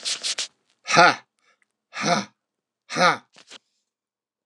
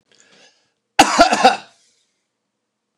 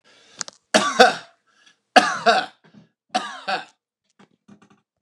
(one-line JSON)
{"exhalation_length": "4.5 s", "exhalation_amplitude": 26973, "exhalation_signal_mean_std_ratio": 0.34, "cough_length": "3.0 s", "cough_amplitude": 29204, "cough_signal_mean_std_ratio": 0.31, "three_cough_length": "5.0 s", "three_cough_amplitude": 29204, "three_cough_signal_mean_std_ratio": 0.31, "survey_phase": "alpha (2021-03-01 to 2021-08-12)", "age": "45-64", "gender": "Male", "wearing_mask": "No", "symptom_none": true, "smoker_status": "Ex-smoker", "respiratory_condition_asthma": false, "respiratory_condition_other": false, "recruitment_source": "REACT", "submission_delay": "1 day", "covid_test_result": "Negative", "covid_test_method": "RT-qPCR"}